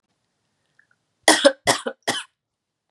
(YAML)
three_cough_length: 2.9 s
three_cough_amplitude: 32768
three_cough_signal_mean_std_ratio: 0.28
survey_phase: beta (2021-08-13 to 2022-03-07)
age: 18-44
gender: Female
wearing_mask: 'No'
symptom_cough_any: true
symptom_runny_or_blocked_nose: true
symptom_sore_throat: true
symptom_fatigue: true
symptom_other: true
symptom_onset: 3 days
smoker_status: Never smoked
respiratory_condition_asthma: false
respiratory_condition_other: false
recruitment_source: Test and Trace
submission_delay: 2 days
covid_test_result: Positive
covid_test_method: RT-qPCR